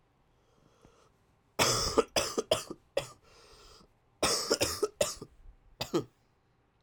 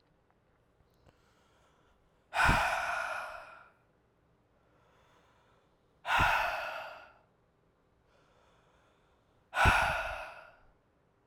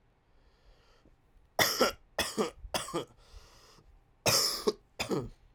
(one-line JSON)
{"cough_length": "6.8 s", "cough_amplitude": 10617, "cough_signal_mean_std_ratio": 0.39, "exhalation_length": "11.3 s", "exhalation_amplitude": 9359, "exhalation_signal_mean_std_ratio": 0.37, "three_cough_length": "5.5 s", "three_cough_amplitude": 9989, "three_cough_signal_mean_std_ratio": 0.42, "survey_phase": "alpha (2021-03-01 to 2021-08-12)", "age": "18-44", "gender": "Male", "wearing_mask": "No", "symptom_cough_any": true, "symptom_new_continuous_cough": true, "symptom_fatigue": true, "symptom_headache": true, "symptom_onset": "2 days", "smoker_status": "Never smoked", "respiratory_condition_asthma": false, "respiratory_condition_other": false, "recruitment_source": "Test and Trace", "submission_delay": "1 day", "covid_test_result": "Positive", "covid_test_method": "RT-qPCR", "covid_ct_value": 34.0, "covid_ct_gene": "N gene"}